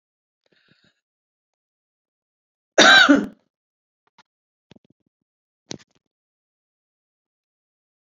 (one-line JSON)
{"cough_length": "8.2 s", "cough_amplitude": 29002, "cough_signal_mean_std_ratio": 0.19, "survey_phase": "beta (2021-08-13 to 2022-03-07)", "age": "65+", "gender": "Female", "wearing_mask": "No", "symptom_none": true, "smoker_status": "Ex-smoker", "respiratory_condition_asthma": false, "respiratory_condition_other": false, "recruitment_source": "REACT", "submission_delay": "4 days", "covid_test_result": "Negative", "covid_test_method": "RT-qPCR"}